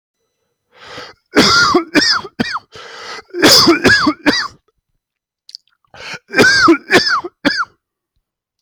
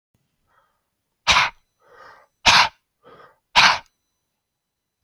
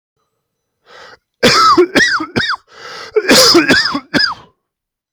{"three_cough_length": "8.6 s", "three_cough_amplitude": 32768, "three_cough_signal_mean_std_ratio": 0.5, "exhalation_length": "5.0 s", "exhalation_amplitude": 32767, "exhalation_signal_mean_std_ratio": 0.28, "cough_length": "5.1 s", "cough_amplitude": 32768, "cough_signal_mean_std_ratio": 0.55, "survey_phase": "beta (2021-08-13 to 2022-03-07)", "age": "45-64", "gender": "Male", "wearing_mask": "No", "symptom_cough_any": true, "symptom_runny_or_blocked_nose": true, "symptom_sore_throat": true, "symptom_fatigue": true, "symptom_fever_high_temperature": true, "symptom_headache": true, "symptom_change_to_sense_of_smell_or_taste": true, "symptom_loss_of_taste": true, "smoker_status": "Never smoked", "respiratory_condition_asthma": true, "respiratory_condition_other": false, "recruitment_source": "Test and Trace", "submission_delay": "2 days", "covid_test_result": "Positive", "covid_test_method": "LFT"}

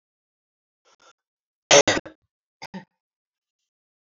{"cough_length": "4.2 s", "cough_amplitude": 28228, "cough_signal_mean_std_ratio": 0.17, "survey_phase": "beta (2021-08-13 to 2022-03-07)", "age": "18-44", "gender": "Female", "wearing_mask": "No", "symptom_none": true, "smoker_status": "Ex-smoker", "respiratory_condition_asthma": false, "respiratory_condition_other": false, "recruitment_source": "REACT", "submission_delay": "3 days", "covid_test_result": "Negative", "covid_test_method": "RT-qPCR", "influenza_a_test_result": "Negative", "influenza_b_test_result": "Negative"}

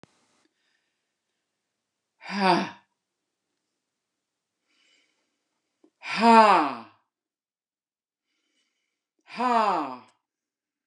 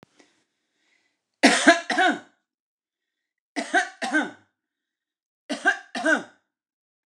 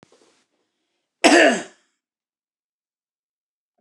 {"exhalation_length": "10.9 s", "exhalation_amplitude": 24319, "exhalation_signal_mean_std_ratio": 0.26, "three_cough_length": "7.1 s", "three_cough_amplitude": 29089, "three_cough_signal_mean_std_ratio": 0.33, "cough_length": "3.8 s", "cough_amplitude": 29204, "cough_signal_mean_std_ratio": 0.24, "survey_phase": "beta (2021-08-13 to 2022-03-07)", "age": "65+", "gender": "Female", "wearing_mask": "No", "symptom_none": true, "smoker_status": "Never smoked", "respiratory_condition_asthma": false, "respiratory_condition_other": false, "recruitment_source": "REACT", "submission_delay": "1 day", "covid_test_result": "Negative", "covid_test_method": "RT-qPCR"}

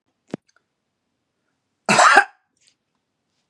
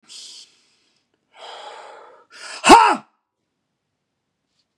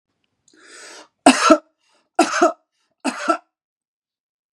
{"cough_length": "3.5 s", "cough_amplitude": 32768, "cough_signal_mean_std_ratio": 0.25, "exhalation_length": "4.8 s", "exhalation_amplitude": 32768, "exhalation_signal_mean_std_ratio": 0.22, "three_cough_length": "4.5 s", "three_cough_amplitude": 32768, "three_cough_signal_mean_std_ratio": 0.3, "survey_phase": "beta (2021-08-13 to 2022-03-07)", "age": "45-64", "gender": "Male", "wearing_mask": "No", "symptom_none": true, "smoker_status": "Ex-smoker", "respiratory_condition_asthma": false, "respiratory_condition_other": false, "recruitment_source": "REACT", "submission_delay": "5 days", "covid_test_result": "Negative", "covid_test_method": "RT-qPCR", "influenza_a_test_result": "Unknown/Void", "influenza_b_test_result": "Unknown/Void"}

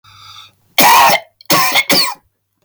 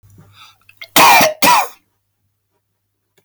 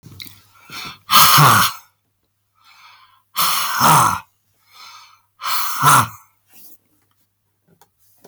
{"three_cough_length": "2.6 s", "three_cough_amplitude": 32768, "three_cough_signal_mean_std_ratio": 0.59, "cough_length": "3.2 s", "cough_amplitude": 32768, "cough_signal_mean_std_ratio": 0.4, "exhalation_length": "8.3 s", "exhalation_amplitude": 32768, "exhalation_signal_mean_std_ratio": 0.41, "survey_phase": "beta (2021-08-13 to 2022-03-07)", "age": "45-64", "gender": "Male", "wearing_mask": "No", "symptom_none": true, "smoker_status": "Ex-smoker", "respiratory_condition_asthma": false, "respiratory_condition_other": false, "recruitment_source": "REACT", "submission_delay": "1 day", "covid_test_result": "Negative", "covid_test_method": "RT-qPCR", "influenza_a_test_result": "Negative", "influenza_b_test_result": "Negative"}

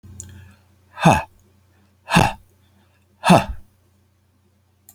{"exhalation_length": "4.9 s", "exhalation_amplitude": 32551, "exhalation_signal_mean_std_ratio": 0.29, "survey_phase": "alpha (2021-03-01 to 2021-08-12)", "age": "45-64", "gender": "Male", "wearing_mask": "No", "symptom_none": true, "smoker_status": "Never smoked", "respiratory_condition_asthma": false, "respiratory_condition_other": false, "recruitment_source": "REACT", "submission_delay": "1 day", "covid_test_result": "Negative", "covid_test_method": "RT-qPCR"}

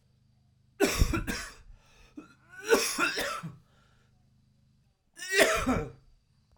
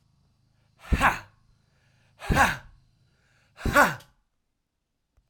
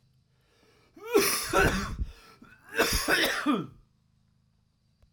{"three_cough_length": "6.6 s", "three_cough_amplitude": 14395, "three_cough_signal_mean_std_ratio": 0.43, "exhalation_length": "5.3 s", "exhalation_amplitude": 18021, "exhalation_signal_mean_std_ratio": 0.3, "cough_length": "5.1 s", "cough_amplitude": 9794, "cough_signal_mean_std_ratio": 0.49, "survey_phase": "alpha (2021-03-01 to 2021-08-12)", "age": "18-44", "gender": "Male", "wearing_mask": "No", "symptom_cough_any": true, "symptom_headache": true, "symptom_onset": "4 days", "smoker_status": "Never smoked", "respiratory_condition_asthma": false, "respiratory_condition_other": false, "recruitment_source": "Test and Trace", "submission_delay": "1 day", "covid_test_result": "Positive", "covid_test_method": "RT-qPCR"}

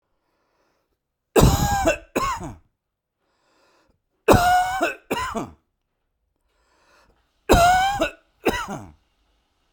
{"three_cough_length": "9.7 s", "three_cough_amplitude": 32767, "three_cough_signal_mean_std_ratio": 0.4, "survey_phase": "beta (2021-08-13 to 2022-03-07)", "age": "45-64", "gender": "Male", "wearing_mask": "No", "symptom_none": true, "smoker_status": "Never smoked", "respiratory_condition_asthma": false, "respiratory_condition_other": false, "recruitment_source": "REACT", "submission_delay": "10 days", "covid_test_result": "Negative", "covid_test_method": "RT-qPCR"}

